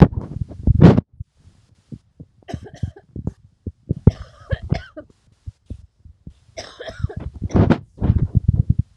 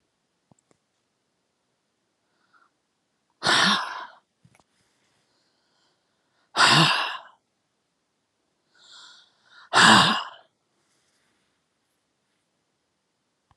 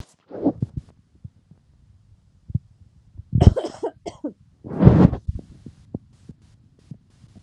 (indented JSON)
{
  "three_cough_length": "9.0 s",
  "three_cough_amplitude": 32768,
  "three_cough_signal_mean_std_ratio": 0.32,
  "exhalation_length": "13.6 s",
  "exhalation_amplitude": 25900,
  "exhalation_signal_mean_std_ratio": 0.26,
  "cough_length": "7.4 s",
  "cough_amplitude": 32768,
  "cough_signal_mean_std_ratio": 0.27,
  "survey_phase": "beta (2021-08-13 to 2022-03-07)",
  "age": "45-64",
  "gender": "Female",
  "wearing_mask": "No",
  "symptom_fatigue": true,
  "symptom_headache": true,
  "symptom_other": true,
  "symptom_onset": "3 days",
  "smoker_status": "Ex-smoker",
  "respiratory_condition_asthma": false,
  "respiratory_condition_other": false,
  "recruitment_source": "Test and Trace",
  "submission_delay": "2 days",
  "covid_test_result": "Positive",
  "covid_test_method": "RT-qPCR",
  "covid_ct_value": 19.4,
  "covid_ct_gene": "ORF1ab gene"
}